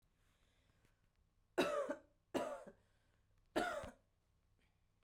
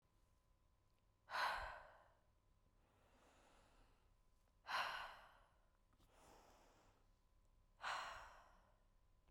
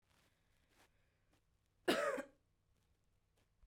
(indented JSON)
{
  "three_cough_length": "5.0 s",
  "three_cough_amplitude": 2201,
  "three_cough_signal_mean_std_ratio": 0.35,
  "exhalation_length": "9.3 s",
  "exhalation_amplitude": 857,
  "exhalation_signal_mean_std_ratio": 0.38,
  "cough_length": "3.7 s",
  "cough_amplitude": 3005,
  "cough_signal_mean_std_ratio": 0.25,
  "survey_phase": "beta (2021-08-13 to 2022-03-07)",
  "age": "18-44",
  "gender": "Female",
  "wearing_mask": "No",
  "symptom_none": true,
  "smoker_status": "Never smoked",
  "respiratory_condition_asthma": false,
  "respiratory_condition_other": false,
  "recruitment_source": "REACT",
  "submission_delay": "6 days",
  "covid_test_result": "Negative",
  "covid_test_method": "RT-qPCR",
  "influenza_a_test_result": "Negative",
  "influenza_b_test_result": "Negative"
}